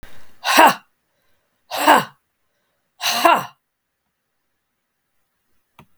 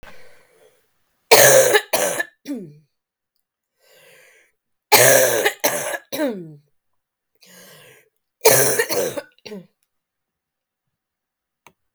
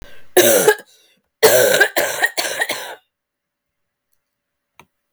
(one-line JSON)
{"exhalation_length": "6.0 s", "exhalation_amplitude": 32768, "exhalation_signal_mean_std_ratio": 0.31, "three_cough_length": "11.9 s", "three_cough_amplitude": 32768, "three_cough_signal_mean_std_ratio": 0.36, "cough_length": "5.1 s", "cough_amplitude": 32766, "cough_signal_mean_std_ratio": 0.43, "survey_phase": "beta (2021-08-13 to 2022-03-07)", "age": "45-64", "gender": "Female", "wearing_mask": "No", "symptom_cough_any": true, "symptom_runny_or_blocked_nose": true, "symptom_sore_throat": true, "symptom_abdominal_pain": true, "symptom_headache": true, "symptom_change_to_sense_of_smell_or_taste": true, "symptom_loss_of_taste": true, "smoker_status": "Never smoked", "respiratory_condition_asthma": true, "respiratory_condition_other": false, "recruitment_source": "Test and Trace", "submission_delay": "3 days", "covid_test_result": "Positive", "covid_test_method": "RT-qPCR", "covid_ct_value": 23.9, "covid_ct_gene": "ORF1ab gene", "covid_ct_mean": 25.3, "covid_viral_load": "5200 copies/ml", "covid_viral_load_category": "Minimal viral load (< 10K copies/ml)"}